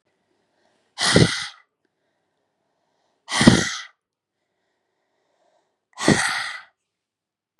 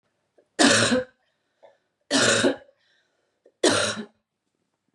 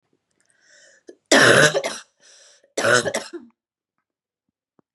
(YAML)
exhalation_length: 7.6 s
exhalation_amplitude: 32768
exhalation_signal_mean_std_ratio: 0.29
three_cough_length: 4.9 s
three_cough_amplitude: 24967
three_cough_signal_mean_std_ratio: 0.41
cough_length: 4.9 s
cough_amplitude: 31297
cough_signal_mean_std_ratio: 0.34
survey_phase: beta (2021-08-13 to 2022-03-07)
age: 18-44
gender: Female
wearing_mask: 'No'
symptom_cough_any: true
symptom_runny_or_blocked_nose: true
symptom_fatigue: true
symptom_other: true
smoker_status: Never smoked
respiratory_condition_asthma: false
respiratory_condition_other: false
recruitment_source: Test and Trace
submission_delay: 1 day
covid_test_result: Positive
covid_test_method: RT-qPCR